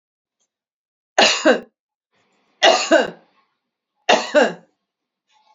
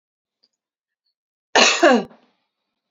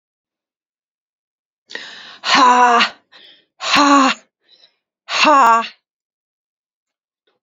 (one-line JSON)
{"three_cough_length": "5.5 s", "three_cough_amplitude": 30861, "three_cough_signal_mean_std_ratio": 0.34, "cough_length": "2.9 s", "cough_amplitude": 32767, "cough_signal_mean_std_ratio": 0.3, "exhalation_length": "7.4 s", "exhalation_amplitude": 31388, "exhalation_signal_mean_std_ratio": 0.4, "survey_phase": "beta (2021-08-13 to 2022-03-07)", "age": "65+", "gender": "Female", "wearing_mask": "No", "symptom_none": true, "smoker_status": "Never smoked", "respiratory_condition_asthma": false, "respiratory_condition_other": false, "recruitment_source": "REACT", "submission_delay": "1 day", "covid_test_result": "Negative", "covid_test_method": "RT-qPCR", "influenza_a_test_result": "Negative", "influenza_b_test_result": "Negative"}